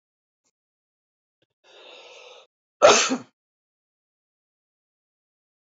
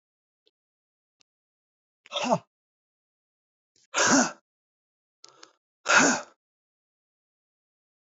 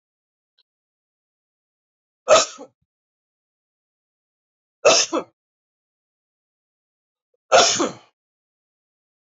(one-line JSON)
{"cough_length": "5.7 s", "cough_amplitude": 27946, "cough_signal_mean_std_ratio": 0.19, "exhalation_length": "8.0 s", "exhalation_amplitude": 16839, "exhalation_signal_mean_std_ratio": 0.26, "three_cough_length": "9.3 s", "three_cough_amplitude": 28124, "three_cough_signal_mean_std_ratio": 0.23, "survey_phase": "beta (2021-08-13 to 2022-03-07)", "age": "18-44", "gender": "Male", "wearing_mask": "No", "symptom_runny_or_blocked_nose": true, "symptom_shortness_of_breath": true, "symptom_fatigue": true, "symptom_fever_high_temperature": true, "symptom_headache": true, "symptom_change_to_sense_of_smell_or_taste": true, "symptom_loss_of_taste": true, "symptom_onset": "4 days", "smoker_status": "Ex-smoker", "respiratory_condition_asthma": false, "respiratory_condition_other": false, "recruitment_source": "Test and Trace", "submission_delay": "2 days", "covid_test_result": "Positive", "covid_test_method": "RT-qPCR", "covid_ct_value": 23.5, "covid_ct_gene": "ORF1ab gene", "covid_ct_mean": 24.0, "covid_viral_load": "14000 copies/ml", "covid_viral_load_category": "Low viral load (10K-1M copies/ml)"}